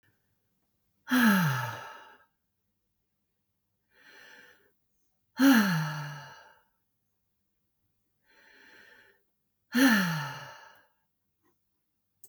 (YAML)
exhalation_length: 12.3 s
exhalation_amplitude: 9679
exhalation_signal_mean_std_ratio: 0.32
survey_phase: beta (2021-08-13 to 2022-03-07)
age: 45-64
gender: Female
wearing_mask: 'No'
symptom_none: true
symptom_onset: 7 days
smoker_status: Never smoked
respiratory_condition_asthma: false
respiratory_condition_other: false
recruitment_source: REACT
submission_delay: 3 days
covid_test_result: Negative
covid_test_method: RT-qPCR
influenza_a_test_result: Negative
influenza_b_test_result: Negative